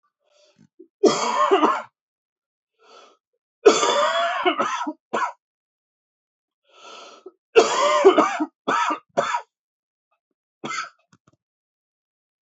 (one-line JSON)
{"three_cough_length": "12.5 s", "three_cough_amplitude": 29798, "three_cough_signal_mean_std_ratio": 0.4, "survey_phase": "beta (2021-08-13 to 2022-03-07)", "age": "18-44", "gender": "Male", "wearing_mask": "No", "symptom_cough_any": true, "symptom_new_continuous_cough": true, "symptom_runny_or_blocked_nose": true, "symptom_fatigue": true, "symptom_fever_high_temperature": true, "symptom_headache": true, "symptom_loss_of_taste": true, "symptom_other": true, "symptom_onset": "5 days", "smoker_status": "Ex-smoker", "respiratory_condition_asthma": true, "respiratory_condition_other": false, "recruitment_source": "Test and Trace", "submission_delay": "2 days", "covid_test_result": "Positive", "covid_test_method": "RT-qPCR", "covid_ct_value": 17.8, "covid_ct_gene": "N gene"}